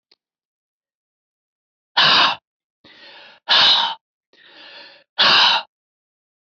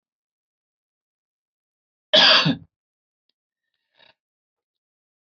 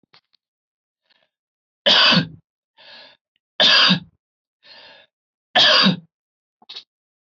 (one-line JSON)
{"exhalation_length": "6.5 s", "exhalation_amplitude": 26574, "exhalation_signal_mean_std_ratio": 0.37, "cough_length": "5.4 s", "cough_amplitude": 28320, "cough_signal_mean_std_ratio": 0.22, "three_cough_length": "7.3 s", "three_cough_amplitude": 26306, "three_cough_signal_mean_std_ratio": 0.35, "survey_phase": "beta (2021-08-13 to 2022-03-07)", "age": "45-64", "gender": "Male", "wearing_mask": "No", "symptom_none": true, "smoker_status": "Never smoked", "respiratory_condition_asthma": false, "respiratory_condition_other": false, "recruitment_source": "REACT", "submission_delay": "1 day", "covid_test_result": "Negative", "covid_test_method": "RT-qPCR", "influenza_a_test_result": "Negative", "influenza_b_test_result": "Negative"}